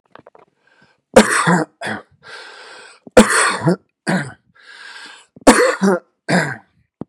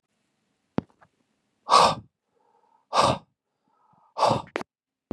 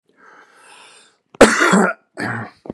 {
  "three_cough_length": "7.1 s",
  "three_cough_amplitude": 32768,
  "three_cough_signal_mean_std_ratio": 0.41,
  "exhalation_length": "5.1 s",
  "exhalation_amplitude": 21856,
  "exhalation_signal_mean_std_ratio": 0.3,
  "cough_length": "2.7 s",
  "cough_amplitude": 32768,
  "cough_signal_mean_std_ratio": 0.38,
  "survey_phase": "beta (2021-08-13 to 2022-03-07)",
  "age": "45-64",
  "gender": "Male",
  "wearing_mask": "No",
  "symptom_none": true,
  "smoker_status": "Never smoked",
  "respiratory_condition_asthma": false,
  "respiratory_condition_other": false,
  "recruitment_source": "REACT",
  "submission_delay": "0 days",
  "covid_test_result": "Negative",
  "covid_test_method": "RT-qPCR",
  "influenza_a_test_result": "Negative",
  "influenza_b_test_result": "Negative"
}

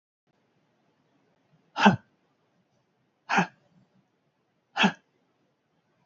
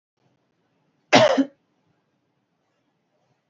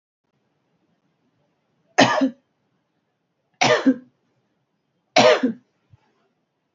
{
  "exhalation_length": "6.1 s",
  "exhalation_amplitude": 24360,
  "exhalation_signal_mean_std_ratio": 0.21,
  "cough_length": "3.5 s",
  "cough_amplitude": 28843,
  "cough_signal_mean_std_ratio": 0.23,
  "three_cough_length": "6.7 s",
  "three_cough_amplitude": 31199,
  "three_cough_signal_mean_std_ratio": 0.29,
  "survey_phase": "beta (2021-08-13 to 2022-03-07)",
  "age": "45-64",
  "gender": "Female",
  "wearing_mask": "No",
  "symptom_runny_or_blocked_nose": true,
  "symptom_sore_throat": true,
  "symptom_abdominal_pain": true,
  "symptom_diarrhoea": true,
  "symptom_fatigue": true,
  "symptom_fever_high_temperature": true,
  "symptom_headache": true,
  "symptom_change_to_sense_of_smell_or_taste": true,
  "symptom_onset": "3 days",
  "smoker_status": "Never smoked",
  "respiratory_condition_asthma": false,
  "respiratory_condition_other": false,
  "recruitment_source": "Test and Trace",
  "submission_delay": "2 days",
  "covid_test_result": "Positive",
  "covid_test_method": "RT-qPCR",
  "covid_ct_value": 14.1,
  "covid_ct_gene": "ORF1ab gene",
  "covid_ct_mean": 14.4,
  "covid_viral_load": "19000000 copies/ml",
  "covid_viral_load_category": "High viral load (>1M copies/ml)"
}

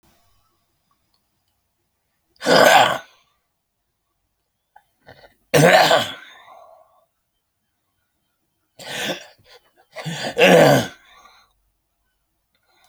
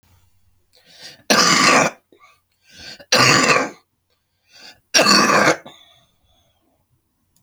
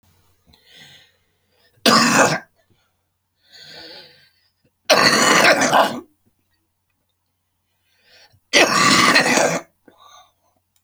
{
  "exhalation_length": "12.9 s",
  "exhalation_amplitude": 32768,
  "exhalation_signal_mean_std_ratio": 0.3,
  "three_cough_length": "7.4 s",
  "three_cough_amplitude": 32767,
  "three_cough_signal_mean_std_ratio": 0.42,
  "cough_length": "10.8 s",
  "cough_amplitude": 32768,
  "cough_signal_mean_std_ratio": 0.41,
  "survey_phase": "beta (2021-08-13 to 2022-03-07)",
  "age": "65+",
  "gender": "Male",
  "wearing_mask": "No",
  "symptom_cough_any": true,
  "symptom_runny_or_blocked_nose": true,
  "symptom_sore_throat": true,
  "symptom_fatigue": true,
  "symptom_headache": true,
  "symptom_change_to_sense_of_smell_or_taste": true,
  "symptom_onset": "3 days",
  "smoker_status": "Ex-smoker",
  "respiratory_condition_asthma": false,
  "respiratory_condition_other": false,
  "recruitment_source": "Test and Trace",
  "submission_delay": "1 day",
  "covid_test_result": "Positive",
  "covid_test_method": "RT-qPCR",
  "covid_ct_value": 15.5,
  "covid_ct_gene": "ORF1ab gene"
}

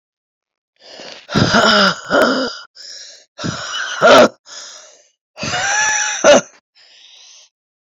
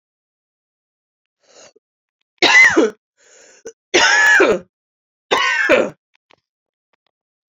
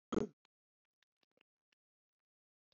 {
  "exhalation_length": "7.9 s",
  "exhalation_amplitude": 32767,
  "exhalation_signal_mean_std_ratio": 0.47,
  "three_cough_length": "7.6 s",
  "three_cough_amplitude": 32767,
  "three_cough_signal_mean_std_ratio": 0.39,
  "cough_length": "2.7 s",
  "cough_amplitude": 2353,
  "cough_signal_mean_std_ratio": 0.15,
  "survey_phase": "beta (2021-08-13 to 2022-03-07)",
  "age": "45-64",
  "gender": "Female",
  "wearing_mask": "No",
  "symptom_runny_or_blocked_nose": true,
  "symptom_shortness_of_breath": true,
  "symptom_sore_throat": true,
  "symptom_abdominal_pain": true,
  "symptom_diarrhoea": true,
  "symptom_fatigue": true,
  "symptom_headache": true,
  "symptom_change_to_sense_of_smell_or_taste": true,
  "symptom_onset": "3 days",
  "smoker_status": "Ex-smoker",
  "respiratory_condition_asthma": false,
  "respiratory_condition_other": false,
  "recruitment_source": "Test and Trace",
  "submission_delay": "1 day",
  "covid_test_result": "Positive",
  "covid_test_method": "RT-qPCR",
  "covid_ct_value": 16.8,
  "covid_ct_gene": "ORF1ab gene",
  "covid_ct_mean": 17.1,
  "covid_viral_load": "2500000 copies/ml",
  "covid_viral_load_category": "High viral load (>1M copies/ml)"
}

